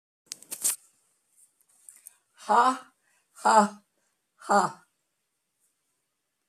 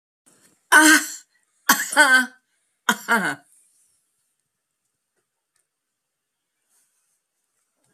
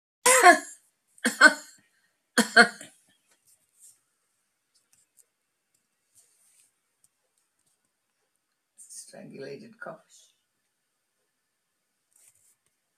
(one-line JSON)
{"exhalation_length": "6.5 s", "exhalation_amplitude": 15917, "exhalation_signal_mean_std_ratio": 0.29, "three_cough_length": "7.9 s", "three_cough_amplitude": 31653, "three_cough_signal_mean_std_ratio": 0.28, "cough_length": "13.0 s", "cough_amplitude": 26243, "cough_signal_mean_std_ratio": 0.19, "survey_phase": "beta (2021-08-13 to 2022-03-07)", "age": "65+", "gender": "Female", "wearing_mask": "No", "symptom_none": true, "smoker_status": "Never smoked", "respiratory_condition_asthma": false, "respiratory_condition_other": false, "recruitment_source": "REACT", "submission_delay": "5 days", "covid_test_result": "Negative", "covid_test_method": "RT-qPCR"}